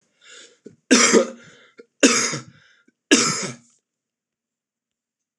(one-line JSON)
{"three_cough_length": "5.4 s", "three_cough_amplitude": 26028, "three_cough_signal_mean_std_ratio": 0.34, "survey_phase": "beta (2021-08-13 to 2022-03-07)", "age": "45-64", "gender": "Male", "wearing_mask": "No", "symptom_cough_any": true, "symptom_runny_or_blocked_nose": true, "symptom_sore_throat": true, "smoker_status": "Never smoked", "respiratory_condition_asthma": false, "respiratory_condition_other": false, "recruitment_source": "REACT", "submission_delay": "3 days", "covid_test_result": "Negative", "covid_test_method": "RT-qPCR", "influenza_a_test_result": "Negative", "influenza_b_test_result": "Negative"}